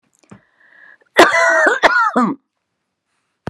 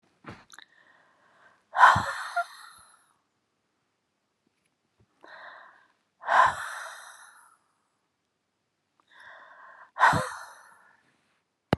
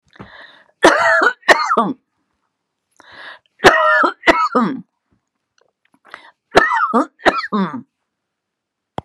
cough_length: 3.5 s
cough_amplitude: 32768
cough_signal_mean_std_ratio: 0.45
exhalation_length: 11.8 s
exhalation_amplitude: 22202
exhalation_signal_mean_std_ratio: 0.25
three_cough_length: 9.0 s
three_cough_amplitude: 32768
three_cough_signal_mean_std_ratio: 0.43
survey_phase: beta (2021-08-13 to 2022-03-07)
age: 65+
gender: Female
wearing_mask: 'No'
symptom_fatigue: true
smoker_status: Ex-smoker
respiratory_condition_asthma: false
respiratory_condition_other: false
recruitment_source: REACT
submission_delay: 5 days
covid_test_result: Negative
covid_test_method: RT-qPCR
influenza_a_test_result: Unknown/Void
influenza_b_test_result: Unknown/Void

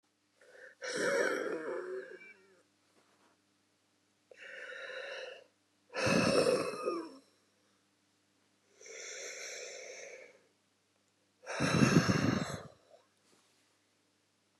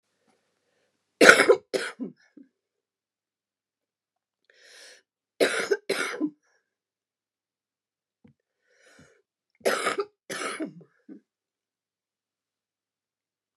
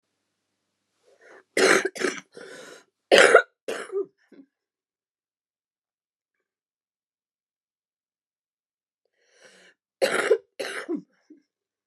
exhalation_length: 14.6 s
exhalation_amplitude: 8686
exhalation_signal_mean_std_ratio: 0.42
three_cough_length: 13.6 s
three_cough_amplitude: 29204
three_cough_signal_mean_std_ratio: 0.22
cough_length: 11.9 s
cough_amplitude: 29204
cough_signal_mean_std_ratio: 0.25
survey_phase: beta (2021-08-13 to 2022-03-07)
age: 65+
gender: Female
wearing_mask: 'No'
symptom_runny_or_blocked_nose: true
smoker_status: Ex-smoker
respiratory_condition_asthma: true
respiratory_condition_other: false
recruitment_source: REACT
submission_delay: 1 day
covid_test_result: Negative
covid_test_method: RT-qPCR
influenza_a_test_result: Negative
influenza_b_test_result: Negative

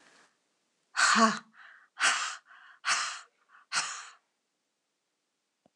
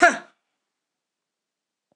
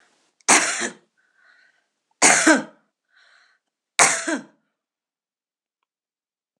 exhalation_length: 5.8 s
exhalation_amplitude: 13242
exhalation_signal_mean_std_ratio: 0.36
cough_length: 2.0 s
cough_amplitude: 26027
cough_signal_mean_std_ratio: 0.19
three_cough_length: 6.6 s
three_cough_amplitude: 26028
three_cough_signal_mean_std_ratio: 0.3
survey_phase: beta (2021-08-13 to 2022-03-07)
age: 65+
gender: Female
wearing_mask: 'No'
symptom_none: true
smoker_status: Ex-smoker
respiratory_condition_asthma: false
respiratory_condition_other: false
recruitment_source: REACT
submission_delay: 1 day
covid_test_result: Negative
covid_test_method: RT-qPCR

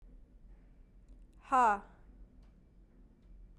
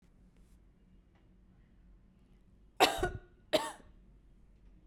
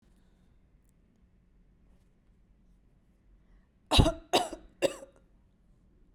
exhalation_length: 3.6 s
exhalation_amplitude: 4330
exhalation_signal_mean_std_ratio: 0.31
cough_length: 4.9 s
cough_amplitude: 9213
cough_signal_mean_std_ratio: 0.26
three_cough_length: 6.1 s
three_cough_amplitude: 12026
three_cough_signal_mean_std_ratio: 0.22
survey_phase: beta (2021-08-13 to 2022-03-07)
age: 18-44
gender: Female
wearing_mask: 'No'
symptom_none: true
smoker_status: Never smoked
respiratory_condition_asthma: false
respiratory_condition_other: false
recruitment_source: REACT
submission_delay: 1 day
covid_test_result: Negative
covid_test_method: RT-qPCR
influenza_a_test_result: Negative
influenza_b_test_result: Negative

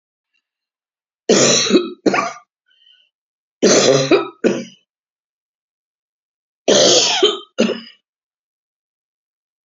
three_cough_length: 9.6 s
three_cough_amplitude: 32768
three_cough_signal_mean_std_ratio: 0.41
survey_phase: beta (2021-08-13 to 2022-03-07)
age: 65+
gender: Female
wearing_mask: 'No'
symptom_none: true
smoker_status: Ex-smoker
respiratory_condition_asthma: false
respiratory_condition_other: false
recruitment_source: REACT
submission_delay: 1 day
covid_test_result: Negative
covid_test_method: RT-qPCR
influenza_a_test_result: Negative
influenza_b_test_result: Negative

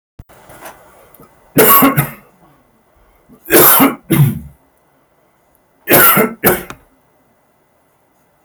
three_cough_length: 8.4 s
three_cough_amplitude: 32768
three_cough_signal_mean_std_ratio: 0.4
survey_phase: beta (2021-08-13 to 2022-03-07)
age: 45-64
gender: Male
wearing_mask: 'No'
symptom_none: true
smoker_status: Never smoked
respiratory_condition_asthma: false
respiratory_condition_other: false
recruitment_source: Test and Trace
submission_delay: 2 days
covid_test_result: Positive
covid_test_method: LFT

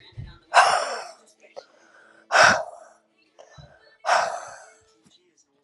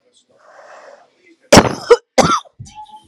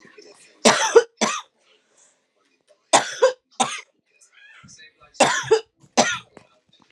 exhalation_length: 5.6 s
exhalation_amplitude: 27853
exhalation_signal_mean_std_ratio: 0.34
cough_length: 3.1 s
cough_amplitude: 32768
cough_signal_mean_std_ratio: 0.31
three_cough_length: 6.9 s
three_cough_amplitude: 32767
three_cough_signal_mean_std_ratio: 0.33
survey_phase: alpha (2021-03-01 to 2021-08-12)
age: 18-44
gender: Female
wearing_mask: 'No'
symptom_shortness_of_breath: true
symptom_fatigue: true
symptom_headache: true
symptom_onset: 6 days
smoker_status: Current smoker (11 or more cigarettes per day)
respiratory_condition_asthma: true
respiratory_condition_other: false
recruitment_source: Test and Trace
submission_delay: 2 days
covid_test_result: Positive
covid_test_method: RT-qPCR
covid_ct_value: 25.1
covid_ct_gene: N gene
covid_ct_mean: 25.6
covid_viral_load: 3900 copies/ml
covid_viral_load_category: Minimal viral load (< 10K copies/ml)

